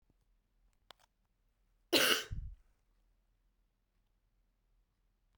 cough_length: 5.4 s
cough_amplitude: 7466
cough_signal_mean_std_ratio: 0.22
survey_phase: beta (2021-08-13 to 2022-03-07)
age: 18-44
gender: Female
wearing_mask: 'No'
symptom_cough_any: true
symptom_new_continuous_cough: true
symptom_runny_or_blocked_nose: true
symptom_sore_throat: true
symptom_fatigue: true
symptom_fever_high_temperature: true
symptom_headache: true
symptom_onset: 3 days
smoker_status: Never smoked
respiratory_condition_asthma: false
respiratory_condition_other: false
recruitment_source: Test and Trace
submission_delay: 1 day
covid_test_result: Positive
covid_test_method: RT-qPCR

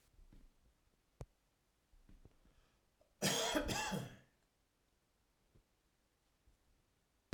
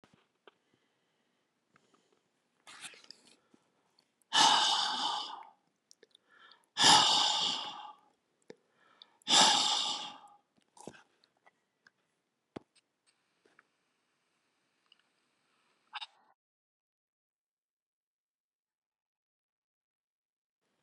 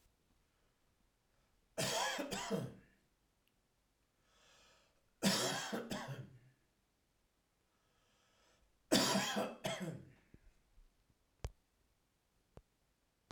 cough_length: 7.3 s
cough_amplitude: 2509
cough_signal_mean_std_ratio: 0.31
exhalation_length: 20.8 s
exhalation_amplitude: 11733
exhalation_signal_mean_std_ratio: 0.27
three_cough_length: 13.3 s
three_cough_amplitude: 4416
three_cough_signal_mean_std_ratio: 0.36
survey_phase: alpha (2021-03-01 to 2021-08-12)
age: 65+
gender: Male
wearing_mask: 'No'
symptom_none: true
smoker_status: Ex-smoker
respiratory_condition_asthma: false
respiratory_condition_other: false
recruitment_source: REACT
submission_delay: 3 days
covid_test_result: Negative
covid_test_method: RT-qPCR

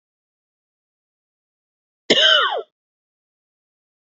cough_length: 4.1 s
cough_amplitude: 29456
cough_signal_mean_std_ratio: 0.27
survey_phase: beta (2021-08-13 to 2022-03-07)
age: 18-44
gender: Male
wearing_mask: 'No'
symptom_cough_any: true
symptom_runny_or_blocked_nose: true
symptom_shortness_of_breath: true
symptom_sore_throat: true
symptom_fatigue: true
symptom_headache: true
symptom_other: true
symptom_onset: 4 days
smoker_status: Current smoker (e-cigarettes or vapes only)
respiratory_condition_asthma: false
respiratory_condition_other: false
recruitment_source: Test and Trace
submission_delay: 1 day
covid_test_result: Positive
covid_test_method: RT-qPCR
covid_ct_value: 20.2
covid_ct_gene: ORF1ab gene
covid_ct_mean: 20.3
covid_viral_load: 220000 copies/ml
covid_viral_load_category: Low viral load (10K-1M copies/ml)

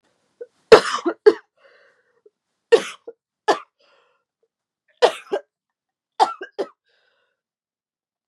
cough_length: 8.3 s
cough_amplitude: 32768
cough_signal_mean_std_ratio: 0.21
survey_phase: beta (2021-08-13 to 2022-03-07)
age: 18-44
gender: Female
wearing_mask: 'No'
symptom_cough_any: true
symptom_runny_or_blocked_nose: true
symptom_sore_throat: true
symptom_headache: true
symptom_onset: 3 days
smoker_status: Never smoked
respiratory_condition_asthma: false
respiratory_condition_other: false
recruitment_source: Test and Trace
submission_delay: 2 days
covid_test_result: Positive
covid_test_method: RT-qPCR
covid_ct_value: 24.1
covid_ct_gene: ORF1ab gene
covid_ct_mean: 24.4
covid_viral_load: 10000 copies/ml
covid_viral_load_category: Low viral load (10K-1M copies/ml)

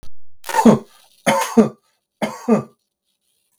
three_cough_length: 3.6 s
three_cough_amplitude: 32768
three_cough_signal_mean_std_ratio: 0.43
survey_phase: beta (2021-08-13 to 2022-03-07)
age: 18-44
gender: Male
wearing_mask: 'No'
symptom_cough_any: true
smoker_status: Never smoked
respiratory_condition_asthma: false
respiratory_condition_other: false
recruitment_source: REACT
submission_delay: 1 day
covid_test_result: Negative
covid_test_method: RT-qPCR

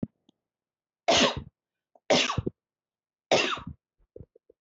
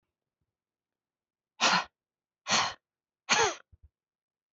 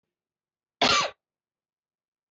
three_cough_length: 4.6 s
three_cough_amplitude: 14145
three_cough_signal_mean_std_ratio: 0.34
exhalation_length: 4.5 s
exhalation_amplitude: 10386
exhalation_signal_mean_std_ratio: 0.31
cough_length: 2.3 s
cough_amplitude: 11366
cough_signal_mean_std_ratio: 0.27
survey_phase: beta (2021-08-13 to 2022-03-07)
age: 18-44
gender: Female
wearing_mask: 'No'
symptom_cough_any: true
symptom_runny_or_blocked_nose: true
symptom_onset: 12 days
smoker_status: Never smoked
respiratory_condition_asthma: false
respiratory_condition_other: false
recruitment_source: REACT
submission_delay: 2 days
covid_test_result: Negative
covid_test_method: RT-qPCR
influenza_a_test_result: Negative
influenza_b_test_result: Negative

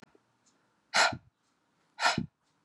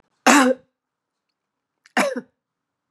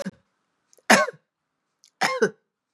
exhalation_length: 2.6 s
exhalation_amplitude: 9549
exhalation_signal_mean_std_ratio: 0.31
cough_length: 2.9 s
cough_amplitude: 30612
cough_signal_mean_std_ratio: 0.31
three_cough_length: 2.7 s
three_cough_amplitude: 32767
three_cough_signal_mean_std_ratio: 0.3
survey_phase: beta (2021-08-13 to 2022-03-07)
age: 45-64
gender: Female
wearing_mask: 'No'
symptom_runny_or_blocked_nose: true
symptom_headache: true
symptom_onset: 5 days
smoker_status: Never smoked
respiratory_condition_asthma: false
respiratory_condition_other: false
recruitment_source: REACT
submission_delay: 2 days
covid_test_result: Negative
covid_test_method: RT-qPCR
influenza_a_test_result: Negative
influenza_b_test_result: Negative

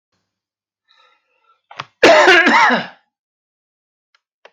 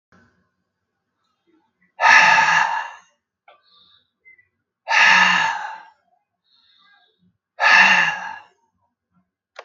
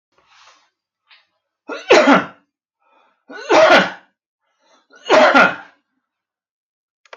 cough_length: 4.5 s
cough_amplitude: 32768
cough_signal_mean_std_ratio: 0.36
exhalation_length: 9.6 s
exhalation_amplitude: 32768
exhalation_signal_mean_std_ratio: 0.39
three_cough_length: 7.2 s
three_cough_amplitude: 32768
three_cough_signal_mean_std_ratio: 0.35
survey_phase: beta (2021-08-13 to 2022-03-07)
age: 65+
gender: Male
wearing_mask: 'No'
symptom_none: true
smoker_status: Never smoked
respiratory_condition_asthma: false
respiratory_condition_other: false
recruitment_source: REACT
submission_delay: 0 days
covid_test_result: Negative
covid_test_method: RT-qPCR
influenza_a_test_result: Negative
influenza_b_test_result: Negative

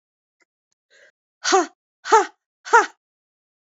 exhalation_length: 3.7 s
exhalation_amplitude: 26178
exhalation_signal_mean_std_ratio: 0.27
survey_phase: beta (2021-08-13 to 2022-03-07)
age: 65+
gender: Female
wearing_mask: 'No'
symptom_cough_any: true
symptom_runny_or_blocked_nose: true
symptom_fatigue: true
symptom_headache: true
symptom_change_to_sense_of_smell_or_taste: true
smoker_status: Never smoked
respiratory_condition_asthma: false
respiratory_condition_other: false
recruitment_source: Test and Trace
submission_delay: 1 day
covid_test_result: Positive
covid_test_method: RT-qPCR
covid_ct_value: 14.2
covid_ct_gene: S gene
covid_ct_mean: 14.6
covid_viral_load: 16000000 copies/ml
covid_viral_load_category: High viral load (>1M copies/ml)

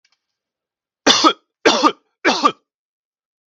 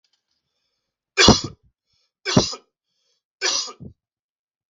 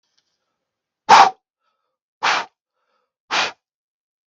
cough_length: 3.5 s
cough_amplitude: 32768
cough_signal_mean_std_ratio: 0.35
three_cough_length: 4.7 s
three_cough_amplitude: 32768
three_cough_signal_mean_std_ratio: 0.27
exhalation_length: 4.3 s
exhalation_amplitude: 32768
exhalation_signal_mean_std_ratio: 0.25
survey_phase: beta (2021-08-13 to 2022-03-07)
age: 45-64
gender: Male
wearing_mask: 'No'
symptom_none: true
smoker_status: Never smoked
respiratory_condition_asthma: false
respiratory_condition_other: false
recruitment_source: REACT
submission_delay: 2 days
covid_test_result: Negative
covid_test_method: RT-qPCR
influenza_a_test_result: Negative
influenza_b_test_result: Negative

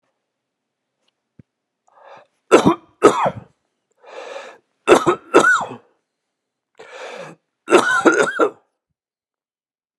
three_cough_length: 10.0 s
three_cough_amplitude: 32768
three_cough_signal_mean_std_ratio: 0.33
survey_phase: beta (2021-08-13 to 2022-03-07)
age: 65+
gender: Male
wearing_mask: 'No'
symptom_none: true
smoker_status: Ex-smoker
respiratory_condition_asthma: false
respiratory_condition_other: false
recruitment_source: REACT
submission_delay: 2 days
covid_test_result: Negative
covid_test_method: RT-qPCR
influenza_a_test_result: Negative
influenza_b_test_result: Negative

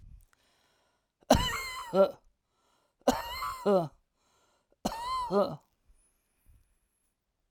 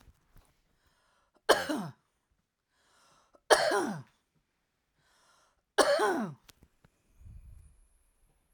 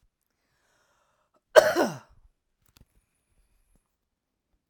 exhalation_length: 7.5 s
exhalation_amplitude: 13035
exhalation_signal_mean_std_ratio: 0.36
three_cough_length: 8.5 s
three_cough_amplitude: 16301
three_cough_signal_mean_std_ratio: 0.3
cough_length: 4.7 s
cough_amplitude: 30496
cough_signal_mean_std_ratio: 0.17
survey_phase: alpha (2021-03-01 to 2021-08-12)
age: 45-64
gender: Female
wearing_mask: 'No'
symptom_change_to_sense_of_smell_or_taste: true
smoker_status: Ex-smoker
respiratory_condition_asthma: true
respiratory_condition_other: false
recruitment_source: REACT
submission_delay: 1 day
covid_test_result: Negative
covid_test_method: RT-qPCR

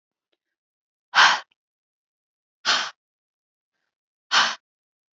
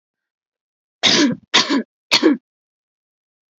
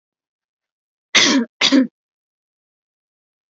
exhalation_length: 5.1 s
exhalation_amplitude: 25126
exhalation_signal_mean_std_ratio: 0.26
three_cough_length: 3.6 s
three_cough_amplitude: 32210
three_cough_signal_mean_std_ratio: 0.38
cough_length: 3.5 s
cough_amplitude: 32768
cough_signal_mean_std_ratio: 0.32
survey_phase: alpha (2021-03-01 to 2021-08-12)
age: 18-44
gender: Female
wearing_mask: 'No'
symptom_none: true
smoker_status: Never smoked
respiratory_condition_asthma: true
respiratory_condition_other: false
recruitment_source: REACT
submission_delay: 2 days
covid_test_result: Negative
covid_test_method: RT-qPCR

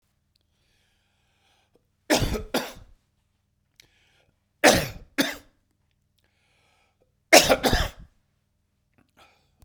three_cough_length: 9.6 s
three_cough_amplitude: 32767
three_cough_signal_mean_std_ratio: 0.25
survey_phase: beta (2021-08-13 to 2022-03-07)
age: 65+
gender: Male
wearing_mask: 'No'
symptom_cough_any: true
symptom_sore_throat: true
symptom_fatigue: true
symptom_headache: true
smoker_status: Ex-smoker
respiratory_condition_asthma: false
respiratory_condition_other: false
recruitment_source: Test and Trace
submission_delay: 3 days
covid_test_result: Positive
covid_test_method: ePCR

